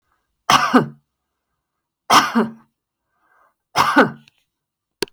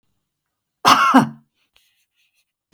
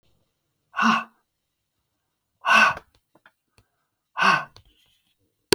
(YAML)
three_cough_length: 5.1 s
three_cough_amplitude: 32591
three_cough_signal_mean_std_ratio: 0.34
cough_length: 2.7 s
cough_amplitude: 32768
cough_signal_mean_std_ratio: 0.31
exhalation_length: 5.5 s
exhalation_amplitude: 30257
exhalation_signal_mean_std_ratio: 0.3
survey_phase: beta (2021-08-13 to 2022-03-07)
age: 45-64
gender: Female
wearing_mask: 'No'
symptom_none: true
symptom_onset: 12 days
smoker_status: Never smoked
respiratory_condition_asthma: false
respiratory_condition_other: false
recruitment_source: REACT
submission_delay: 3 days
covid_test_result: Negative
covid_test_method: RT-qPCR